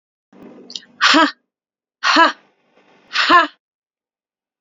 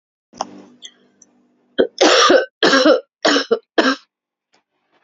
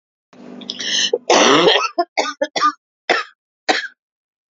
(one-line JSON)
{"exhalation_length": "4.6 s", "exhalation_amplitude": 32714, "exhalation_signal_mean_std_ratio": 0.36, "three_cough_length": "5.0 s", "three_cough_amplitude": 29990, "three_cough_signal_mean_std_ratio": 0.43, "cough_length": "4.5 s", "cough_amplitude": 32768, "cough_signal_mean_std_ratio": 0.49, "survey_phase": "beta (2021-08-13 to 2022-03-07)", "age": "45-64", "gender": "Female", "wearing_mask": "No", "symptom_cough_any": true, "symptom_change_to_sense_of_smell_or_taste": true, "symptom_loss_of_taste": true, "smoker_status": "Never smoked", "respiratory_condition_asthma": false, "respiratory_condition_other": false, "recruitment_source": "Test and Trace", "submission_delay": "2 days", "covid_test_result": "Positive", "covid_test_method": "RT-qPCR", "covid_ct_value": 24.5, "covid_ct_gene": "ORF1ab gene", "covid_ct_mean": 25.0, "covid_viral_load": "6400 copies/ml", "covid_viral_load_category": "Minimal viral load (< 10K copies/ml)"}